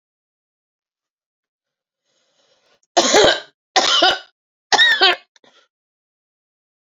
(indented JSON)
{
  "three_cough_length": "6.9 s",
  "three_cough_amplitude": 32767,
  "three_cough_signal_mean_std_ratio": 0.33,
  "survey_phase": "beta (2021-08-13 to 2022-03-07)",
  "age": "18-44",
  "gender": "Female",
  "wearing_mask": "No",
  "symptom_cough_any": true,
  "symptom_runny_or_blocked_nose": true,
  "symptom_diarrhoea": true,
  "symptom_other": true,
  "smoker_status": "Never smoked",
  "respiratory_condition_asthma": false,
  "respiratory_condition_other": false,
  "recruitment_source": "Test and Trace",
  "submission_delay": "13 days",
  "covid_test_result": "Negative",
  "covid_test_method": "RT-qPCR"
}